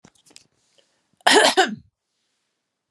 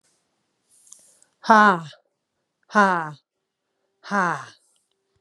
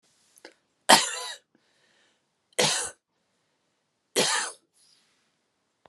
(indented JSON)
{
  "cough_length": "2.9 s",
  "cough_amplitude": 32704,
  "cough_signal_mean_std_ratio": 0.3,
  "exhalation_length": "5.2 s",
  "exhalation_amplitude": 28070,
  "exhalation_signal_mean_std_ratio": 0.28,
  "three_cough_length": "5.9 s",
  "three_cough_amplitude": 31494,
  "three_cough_signal_mean_std_ratio": 0.27,
  "survey_phase": "beta (2021-08-13 to 2022-03-07)",
  "age": "45-64",
  "gender": "Female",
  "wearing_mask": "No",
  "symptom_none": true,
  "smoker_status": "Never smoked",
  "respiratory_condition_asthma": false,
  "respiratory_condition_other": false,
  "recruitment_source": "Test and Trace",
  "submission_delay": "2 days",
  "covid_test_result": "Positive",
  "covid_test_method": "RT-qPCR",
  "covid_ct_value": 33.0,
  "covid_ct_gene": "ORF1ab gene"
}